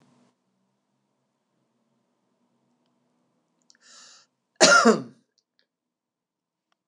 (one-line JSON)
{"cough_length": "6.9 s", "cough_amplitude": 25363, "cough_signal_mean_std_ratio": 0.19, "survey_phase": "beta (2021-08-13 to 2022-03-07)", "age": "65+", "gender": "Male", "wearing_mask": "No", "symptom_none": true, "smoker_status": "Ex-smoker", "respiratory_condition_asthma": false, "respiratory_condition_other": false, "recruitment_source": "REACT", "submission_delay": "3 days", "covid_test_result": "Negative", "covid_test_method": "RT-qPCR", "influenza_a_test_result": "Negative", "influenza_b_test_result": "Negative"}